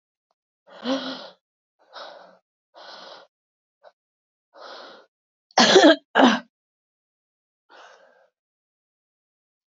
exhalation_length: 9.7 s
exhalation_amplitude: 26521
exhalation_signal_mean_std_ratio: 0.23
survey_phase: beta (2021-08-13 to 2022-03-07)
age: 45-64
gender: Female
wearing_mask: 'No'
symptom_cough_any: true
symptom_runny_or_blocked_nose: true
symptom_headache: true
symptom_onset: 2 days
smoker_status: Never smoked
respiratory_condition_asthma: false
respiratory_condition_other: false
recruitment_source: Test and Trace
submission_delay: 2 days
covid_test_result: Positive
covid_test_method: RT-qPCR
covid_ct_value: 17.8
covid_ct_gene: ORF1ab gene
covid_ct_mean: 18.1
covid_viral_load: 1100000 copies/ml
covid_viral_load_category: High viral load (>1M copies/ml)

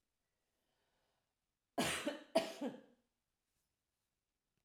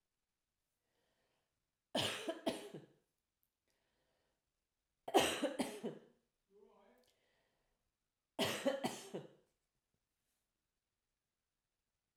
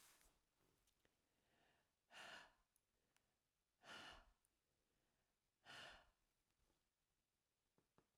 cough_length: 4.6 s
cough_amplitude: 3026
cough_signal_mean_std_ratio: 0.28
three_cough_length: 12.2 s
three_cough_amplitude: 4031
three_cough_signal_mean_std_ratio: 0.29
exhalation_length: 8.2 s
exhalation_amplitude: 144
exhalation_signal_mean_std_ratio: 0.39
survey_phase: alpha (2021-03-01 to 2021-08-12)
age: 45-64
gender: Female
wearing_mask: 'No'
symptom_none: true
smoker_status: Ex-smoker
respiratory_condition_asthma: false
respiratory_condition_other: false
recruitment_source: REACT
submission_delay: 1 day
covid_test_result: Negative
covid_test_method: RT-qPCR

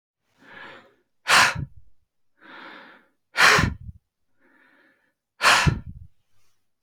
exhalation_length: 6.8 s
exhalation_amplitude: 27696
exhalation_signal_mean_std_ratio: 0.33
survey_phase: beta (2021-08-13 to 2022-03-07)
age: 65+
gender: Male
wearing_mask: 'No'
symptom_none: true
smoker_status: Never smoked
respiratory_condition_asthma: false
respiratory_condition_other: false
recruitment_source: REACT
submission_delay: 2 days
covid_test_result: Negative
covid_test_method: RT-qPCR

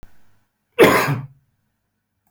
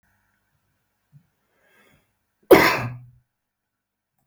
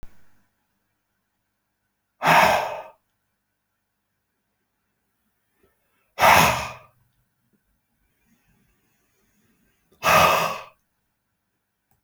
cough_length: 2.3 s
cough_amplitude: 28337
cough_signal_mean_std_ratio: 0.33
three_cough_length: 4.3 s
three_cough_amplitude: 28179
three_cough_signal_mean_std_ratio: 0.2
exhalation_length: 12.0 s
exhalation_amplitude: 27209
exhalation_signal_mean_std_ratio: 0.28
survey_phase: beta (2021-08-13 to 2022-03-07)
age: 45-64
gender: Male
wearing_mask: 'No'
symptom_none: true
smoker_status: Never smoked
respiratory_condition_asthma: false
respiratory_condition_other: false
recruitment_source: REACT
submission_delay: 1 day
covid_test_result: Negative
covid_test_method: RT-qPCR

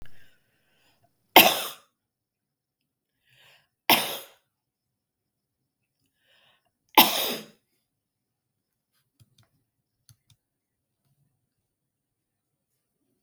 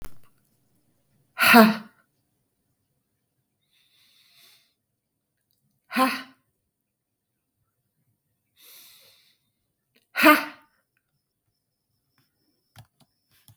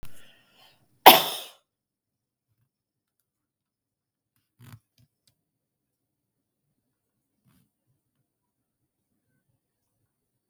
three_cough_length: 13.2 s
three_cough_amplitude: 32766
three_cough_signal_mean_std_ratio: 0.17
exhalation_length: 13.6 s
exhalation_amplitude: 26325
exhalation_signal_mean_std_ratio: 0.19
cough_length: 10.5 s
cough_amplitude: 32767
cough_signal_mean_std_ratio: 0.11
survey_phase: beta (2021-08-13 to 2022-03-07)
age: 65+
gender: Female
wearing_mask: 'No'
symptom_none: true
smoker_status: Ex-smoker
respiratory_condition_asthma: false
respiratory_condition_other: false
recruitment_source: REACT
submission_delay: 9 days
covid_test_result: Negative
covid_test_method: RT-qPCR
influenza_a_test_result: Negative
influenza_b_test_result: Negative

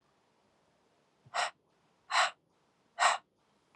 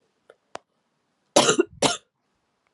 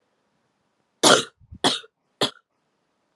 exhalation_length: 3.8 s
exhalation_amplitude: 6423
exhalation_signal_mean_std_ratio: 0.29
cough_length: 2.7 s
cough_amplitude: 24023
cough_signal_mean_std_ratio: 0.28
three_cough_length: 3.2 s
three_cough_amplitude: 30757
three_cough_signal_mean_std_ratio: 0.26
survey_phase: alpha (2021-03-01 to 2021-08-12)
age: 18-44
gender: Female
wearing_mask: 'No'
symptom_headache: true
symptom_change_to_sense_of_smell_or_taste: true
symptom_onset: 3 days
smoker_status: Never smoked
respiratory_condition_asthma: false
respiratory_condition_other: false
recruitment_source: Test and Trace
submission_delay: 1 day
covid_test_result: Positive
covid_test_method: RT-qPCR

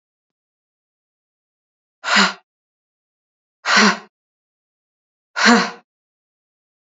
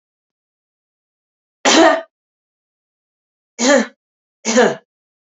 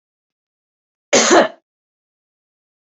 exhalation_length: 6.8 s
exhalation_amplitude: 31159
exhalation_signal_mean_std_ratio: 0.28
three_cough_length: 5.3 s
three_cough_amplitude: 29796
three_cough_signal_mean_std_ratio: 0.32
cough_length: 2.8 s
cough_amplitude: 31769
cough_signal_mean_std_ratio: 0.28
survey_phase: beta (2021-08-13 to 2022-03-07)
age: 18-44
gender: Female
wearing_mask: 'Yes'
symptom_shortness_of_breath: true
symptom_sore_throat: true
symptom_fatigue: true
symptom_headache: true
symptom_onset: 5 days
smoker_status: Never smoked
respiratory_condition_asthma: false
respiratory_condition_other: false
recruitment_source: Test and Trace
submission_delay: 3 days
covid_test_result: Positive
covid_test_method: RT-qPCR
covid_ct_value: 22.5
covid_ct_gene: S gene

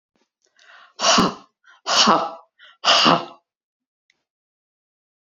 exhalation_length: 5.2 s
exhalation_amplitude: 27884
exhalation_signal_mean_std_ratio: 0.37
survey_phase: beta (2021-08-13 to 2022-03-07)
age: 65+
gender: Female
wearing_mask: 'No'
symptom_none: true
smoker_status: Ex-smoker
respiratory_condition_asthma: false
respiratory_condition_other: false
recruitment_source: REACT
submission_delay: 1 day
covid_test_result: Negative
covid_test_method: RT-qPCR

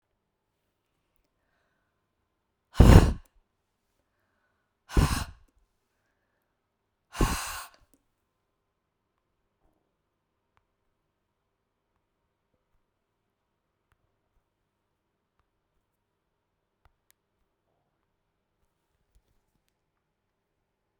exhalation_length: 21.0 s
exhalation_amplitude: 32768
exhalation_signal_mean_std_ratio: 0.13
survey_phase: beta (2021-08-13 to 2022-03-07)
age: 65+
gender: Female
wearing_mask: 'No'
symptom_none: true
smoker_status: Never smoked
respiratory_condition_asthma: false
respiratory_condition_other: false
recruitment_source: REACT
submission_delay: 3 days
covid_test_result: Negative
covid_test_method: RT-qPCR
influenza_a_test_result: Negative
influenza_b_test_result: Negative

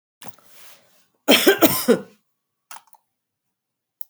cough_length: 4.1 s
cough_amplitude: 32768
cough_signal_mean_std_ratio: 0.29
survey_phase: beta (2021-08-13 to 2022-03-07)
age: 65+
gender: Female
wearing_mask: 'No'
symptom_none: true
smoker_status: Ex-smoker
respiratory_condition_asthma: false
respiratory_condition_other: false
recruitment_source: REACT
submission_delay: 2 days
covid_test_result: Negative
covid_test_method: RT-qPCR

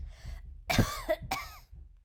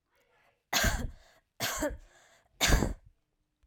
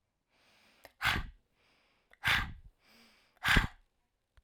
cough_length: 2.0 s
cough_amplitude: 9099
cough_signal_mean_std_ratio: 0.53
three_cough_length: 3.7 s
three_cough_amplitude: 9975
three_cough_signal_mean_std_ratio: 0.41
exhalation_length: 4.4 s
exhalation_amplitude: 9429
exhalation_signal_mean_std_ratio: 0.32
survey_phase: alpha (2021-03-01 to 2021-08-12)
age: 18-44
gender: Female
wearing_mask: 'No'
symptom_none: true
smoker_status: Never smoked
respiratory_condition_asthma: false
respiratory_condition_other: false
recruitment_source: REACT
submission_delay: 1 day
covid_test_result: Negative
covid_test_method: RT-qPCR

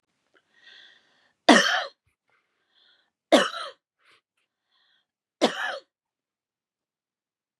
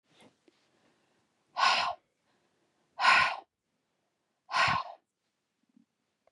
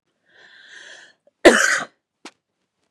three_cough_length: 7.6 s
three_cough_amplitude: 29555
three_cough_signal_mean_std_ratio: 0.23
exhalation_length: 6.3 s
exhalation_amplitude: 8904
exhalation_signal_mean_std_ratio: 0.32
cough_length: 2.9 s
cough_amplitude: 32768
cough_signal_mean_std_ratio: 0.26
survey_phase: beta (2021-08-13 to 2022-03-07)
age: 45-64
gender: Female
wearing_mask: 'No'
symptom_none: true
smoker_status: Never smoked
respiratory_condition_asthma: false
respiratory_condition_other: false
recruitment_source: Test and Trace
submission_delay: 1 day
covid_test_result: Positive
covid_test_method: ePCR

